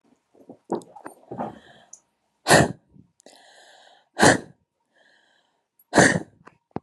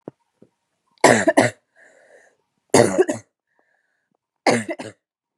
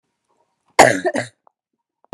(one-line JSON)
{"exhalation_length": "6.8 s", "exhalation_amplitude": 31841, "exhalation_signal_mean_std_ratio": 0.27, "three_cough_length": "5.4 s", "three_cough_amplitude": 32767, "three_cough_signal_mean_std_ratio": 0.31, "cough_length": "2.1 s", "cough_amplitude": 32768, "cough_signal_mean_std_ratio": 0.27, "survey_phase": "beta (2021-08-13 to 2022-03-07)", "age": "18-44", "gender": "Female", "wearing_mask": "No", "symptom_none": true, "smoker_status": "Current smoker (1 to 10 cigarettes per day)", "respiratory_condition_asthma": false, "respiratory_condition_other": false, "recruitment_source": "REACT", "submission_delay": "1 day", "covid_test_result": "Negative", "covid_test_method": "RT-qPCR"}